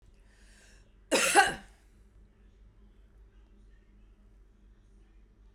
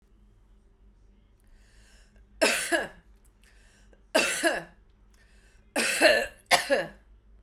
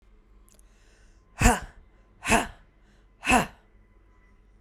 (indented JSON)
{
  "cough_length": "5.5 s",
  "cough_amplitude": 12620,
  "cough_signal_mean_std_ratio": 0.26,
  "three_cough_length": "7.4 s",
  "three_cough_amplitude": 17444,
  "three_cough_signal_mean_std_ratio": 0.38,
  "exhalation_length": "4.6 s",
  "exhalation_amplitude": 18341,
  "exhalation_signal_mean_std_ratio": 0.3,
  "survey_phase": "beta (2021-08-13 to 2022-03-07)",
  "age": "18-44",
  "gender": "Female",
  "wearing_mask": "No",
  "symptom_none": true,
  "smoker_status": "Never smoked",
  "respiratory_condition_asthma": false,
  "respiratory_condition_other": false,
  "recruitment_source": "REACT",
  "submission_delay": "0 days",
  "covid_test_result": "Negative",
  "covid_test_method": "RT-qPCR"
}